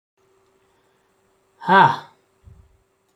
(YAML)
exhalation_length: 3.2 s
exhalation_amplitude: 30115
exhalation_signal_mean_std_ratio: 0.25
survey_phase: alpha (2021-03-01 to 2021-08-12)
age: 45-64
gender: Male
wearing_mask: 'No'
symptom_none: true
smoker_status: Never smoked
respiratory_condition_asthma: false
respiratory_condition_other: false
recruitment_source: REACT
submission_delay: 2 days
covid_test_result: Negative
covid_test_method: RT-qPCR